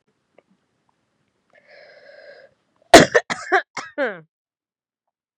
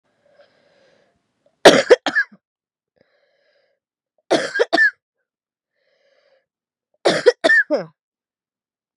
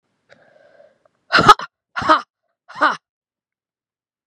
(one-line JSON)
{"cough_length": "5.4 s", "cough_amplitude": 32768, "cough_signal_mean_std_ratio": 0.2, "three_cough_length": "9.0 s", "three_cough_amplitude": 32768, "three_cough_signal_mean_std_ratio": 0.28, "exhalation_length": "4.3 s", "exhalation_amplitude": 32768, "exhalation_signal_mean_std_ratio": 0.26, "survey_phase": "beta (2021-08-13 to 2022-03-07)", "age": "45-64", "gender": "Female", "wearing_mask": "No", "symptom_cough_any": true, "symptom_runny_or_blocked_nose": true, "symptom_onset": "4 days", "smoker_status": "Never smoked", "respiratory_condition_asthma": false, "respiratory_condition_other": false, "recruitment_source": "Test and Trace", "submission_delay": "1 day", "covid_test_method": "RT-qPCR", "covid_ct_value": 32.8, "covid_ct_gene": "ORF1ab gene", "covid_ct_mean": 32.9, "covid_viral_load": "16 copies/ml", "covid_viral_load_category": "Minimal viral load (< 10K copies/ml)"}